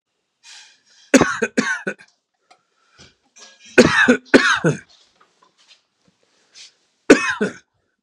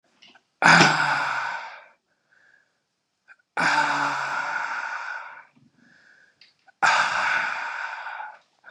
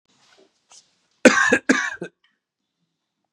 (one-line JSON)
{"three_cough_length": "8.0 s", "three_cough_amplitude": 32768, "three_cough_signal_mean_std_ratio": 0.32, "exhalation_length": "8.7 s", "exhalation_amplitude": 30969, "exhalation_signal_mean_std_ratio": 0.5, "cough_length": "3.3 s", "cough_amplitude": 32768, "cough_signal_mean_std_ratio": 0.28, "survey_phase": "beta (2021-08-13 to 2022-03-07)", "age": "18-44", "gender": "Male", "wearing_mask": "No", "symptom_cough_any": true, "symptom_runny_or_blocked_nose": true, "symptom_shortness_of_breath": true, "symptom_fatigue": true, "symptom_headache": true, "symptom_change_to_sense_of_smell_or_taste": true, "smoker_status": "Never smoked", "respiratory_condition_asthma": true, "respiratory_condition_other": false, "recruitment_source": "Test and Trace", "submission_delay": "1 day", "covid_test_result": "Positive", "covid_test_method": "RT-qPCR", "covid_ct_value": 23.0, "covid_ct_gene": "ORF1ab gene"}